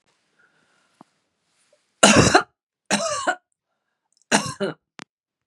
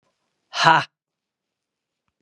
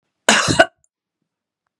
{
  "three_cough_length": "5.5 s",
  "three_cough_amplitude": 32768,
  "three_cough_signal_mean_std_ratio": 0.3,
  "exhalation_length": "2.2 s",
  "exhalation_amplitude": 32767,
  "exhalation_signal_mean_std_ratio": 0.25,
  "cough_length": "1.8 s",
  "cough_amplitude": 32768,
  "cough_signal_mean_std_ratio": 0.32,
  "survey_phase": "beta (2021-08-13 to 2022-03-07)",
  "age": "65+",
  "gender": "Female",
  "wearing_mask": "No",
  "symptom_none": true,
  "smoker_status": "Never smoked",
  "respiratory_condition_asthma": false,
  "respiratory_condition_other": false,
  "recruitment_source": "Test and Trace",
  "submission_delay": "0 days",
  "covid_test_result": "Negative",
  "covid_test_method": "RT-qPCR"
}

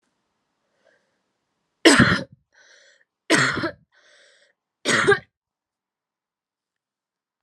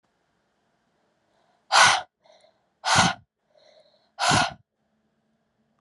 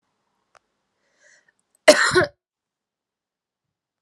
{
  "three_cough_length": "7.4 s",
  "three_cough_amplitude": 31725,
  "three_cough_signal_mean_std_ratio": 0.28,
  "exhalation_length": "5.8 s",
  "exhalation_amplitude": 22964,
  "exhalation_signal_mean_std_ratio": 0.3,
  "cough_length": "4.0 s",
  "cough_amplitude": 32768,
  "cough_signal_mean_std_ratio": 0.21,
  "survey_phase": "beta (2021-08-13 to 2022-03-07)",
  "age": "18-44",
  "gender": "Female",
  "wearing_mask": "No",
  "symptom_runny_or_blocked_nose": true,
  "symptom_fatigue": true,
  "symptom_fever_high_temperature": true,
  "symptom_headache": true,
  "symptom_onset": "3 days",
  "smoker_status": "Never smoked",
  "respiratory_condition_asthma": false,
  "respiratory_condition_other": false,
  "recruitment_source": "Test and Trace",
  "submission_delay": "1 day",
  "covid_test_result": "Positive",
  "covid_test_method": "RT-qPCR",
  "covid_ct_value": 19.6,
  "covid_ct_gene": "ORF1ab gene",
  "covid_ct_mean": 20.2,
  "covid_viral_load": "240000 copies/ml",
  "covid_viral_load_category": "Low viral load (10K-1M copies/ml)"
}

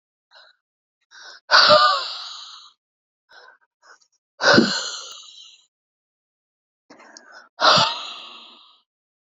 {
  "exhalation_length": "9.4 s",
  "exhalation_amplitude": 27624,
  "exhalation_signal_mean_std_ratio": 0.32,
  "survey_phase": "beta (2021-08-13 to 2022-03-07)",
  "age": "18-44",
  "gender": "Female",
  "wearing_mask": "Yes",
  "symptom_none": true,
  "smoker_status": "Ex-smoker",
  "respiratory_condition_asthma": true,
  "respiratory_condition_other": false,
  "recruitment_source": "REACT",
  "submission_delay": "1 day",
  "covid_test_result": "Negative",
  "covid_test_method": "RT-qPCR"
}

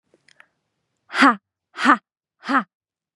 {
  "exhalation_length": "3.2 s",
  "exhalation_amplitude": 30135,
  "exhalation_signal_mean_std_ratio": 0.3,
  "survey_phase": "beta (2021-08-13 to 2022-03-07)",
  "age": "18-44",
  "gender": "Female",
  "wearing_mask": "No",
  "symptom_fatigue": true,
  "symptom_headache": true,
  "smoker_status": "Never smoked",
  "respiratory_condition_asthma": false,
  "respiratory_condition_other": false,
  "recruitment_source": "REACT",
  "submission_delay": "1 day",
  "covid_test_result": "Negative",
  "covid_test_method": "RT-qPCR",
  "influenza_a_test_result": "Negative",
  "influenza_b_test_result": "Negative"
}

